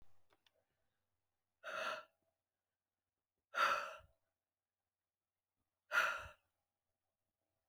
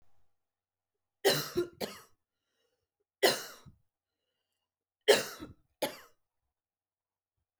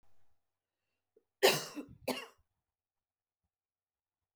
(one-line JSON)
{"exhalation_length": "7.7 s", "exhalation_amplitude": 2281, "exhalation_signal_mean_std_ratio": 0.28, "three_cough_length": "7.6 s", "three_cough_amplitude": 11289, "three_cough_signal_mean_std_ratio": 0.25, "cough_length": "4.4 s", "cough_amplitude": 7927, "cough_signal_mean_std_ratio": 0.21, "survey_phase": "beta (2021-08-13 to 2022-03-07)", "age": "45-64", "gender": "Female", "wearing_mask": "No", "symptom_none": true, "smoker_status": "Never smoked", "respiratory_condition_asthma": false, "respiratory_condition_other": false, "recruitment_source": "REACT", "submission_delay": "3 days", "covid_test_result": "Negative", "covid_test_method": "RT-qPCR"}